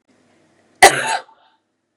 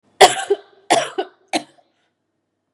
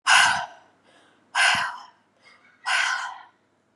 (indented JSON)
{
  "cough_length": "2.0 s",
  "cough_amplitude": 32768,
  "cough_signal_mean_std_ratio": 0.26,
  "three_cough_length": "2.7 s",
  "three_cough_amplitude": 32768,
  "three_cough_signal_mean_std_ratio": 0.3,
  "exhalation_length": "3.8 s",
  "exhalation_amplitude": 25966,
  "exhalation_signal_mean_std_ratio": 0.45,
  "survey_phase": "beta (2021-08-13 to 2022-03-07)",
  "age": "18-44",
  "gender": "Female",
  "wearing_mask": "No",
  "symptom_cough_any": true,
  "symptom_runny_or_blocked_nose": true,
  "symptom_sore_throat": true,
  "symptom_fatigue": true,
  "symptom_headache": true,
  "symptom_onset": "4 days",
  "smoker_status": "Never smoked",
  "respiratory_condition_asthma": false,
  "respiratory_condition_other": false,
  "recruitment_source": "Test and Trace",
  "submission_delay": "2 days",
  "covid_test_result": "Positive",
  "covid_test_method": "ePCR"
}